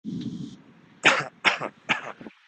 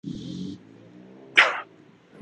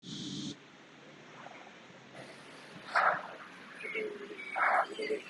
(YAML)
three_cough_length: 2.5 s
three_cough_amplitude: 23327
three_cough_signal_mean_std_ratio: 0.43
cough_length: 2.2 s
cough_amplitude: 28445
cough_signal_mean_std_ratio: 0.34
exhalation_length: 5.3 s
exhalation_amplitude: 5412
exhalation_signal_mean_std_ratio: 0.55
survey_phase: beta (2021-08-13 to 2022-03-07)
age: 18-44
gender: Male
wearing_mask: 'Yes'
symptom_none: true
smoker_status: Prefer not to say
respiratory_condition_asthma: false
respiratory_condition_other: false
recruitment_source: REACT
submission_delay: -6 days
covid_test_result: Negative
covid_test_method: RT-qPCR
influenza_a_test_result: Negative
influenza_b_test_result: Negative